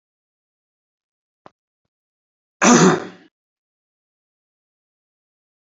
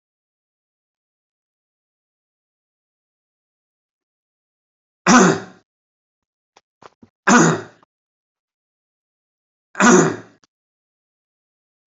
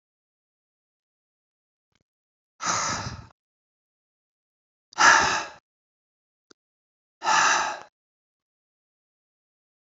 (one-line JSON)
{"cough_length": "5.6 s", "cough_amplitude": 31071, "cough_signal_mean_std_ratio": 0.21, "three_cough_length": "11.9 s", "three_cough_amplitude": 30370, "three_cough_signal_mean_std_ratio": 0.23, "exhalation_length": "10.0 s", "exhalation_amplitude": 24592, "exhalation_signal_mean_std_ratio": 0.27, "survey_phase": "beta (2021-08-13 to 2022-03-07)", "age": "65+", "gender": "Male", "wearing_mask": "No", "symptom_none": true, "smoker_status": "Ex-smoker", "respiratory_condition_asthma": false, "respiratory_condition_other": false, "recruitment_source": "REACT", "submission_delay": "3 days", "covid_test_result": "Negative", "covid_test_method": "RT-qPCR"}